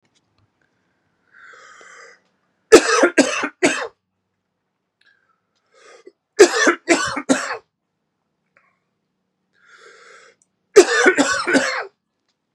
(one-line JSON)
{"three_cough_length": "12.5 s", "three_cough_amplitude": 32768, "three_cough_signal_mean_std_ratio": 0.31, "survey_phase": "beta (2021-08-13 to 2022-03-07)", "age": "45-64", "gender": "Male", "wearing_mask": "No", "symptom_runny_or_blocked_nose": true, "symptom_sore_throat": true, "symptom_headache": true, "smoker_status": "Never smoked", "respiratory_condition_asthma": false, "respiratory_condition_other": false, "recruitment_source": "Test and Trace", "submission_delay": "2 days", "covid_test_result": "Positive", "covid_test_method": "RT-qPCR", "covid_ct_value": 24.3, "covid_ct_gene": "ORF1ab gene", "covid_ct_mean": 25.3, "covid_viral_load": "5100 copies/ml", "covid_viral_load_category": "Minimal viral load (< 10K copies/ml)"}